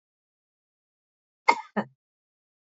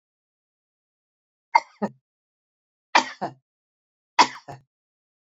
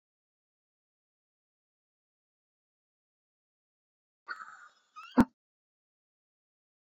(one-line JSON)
{"cough_length": "2.6 s", "cough_amplitude": 25477, "cough_signal_mean_std_ratio": 0.16, "three_cough_length": "5.4 s", "three_cough_amplitude": 27459, "three_cough_signal_mean_std_ratio": 0.17, "exhalation_length": "6.9 s", "exhalation_amplitude": 11465, "exhalation_signal_mean_std_ratio": 0.1, "survey_phase": "beta (2021-08-13 to 2022-03-07)", "age": "65+", "gender": "Female", "wearing_mask": "No", "symptom_none": true, "smoker_status": "Never smoked", "respiratory_condition_asthma": false, "respiratory_condition_other": false, "recruitment_source": "REACT", "submission_delay": "1 day", "covid_test_result": "Negative", "covid_test_method": "RT-qPCR", "covid_ct_value": 38.0, "covid_ct_gene": "N gene"}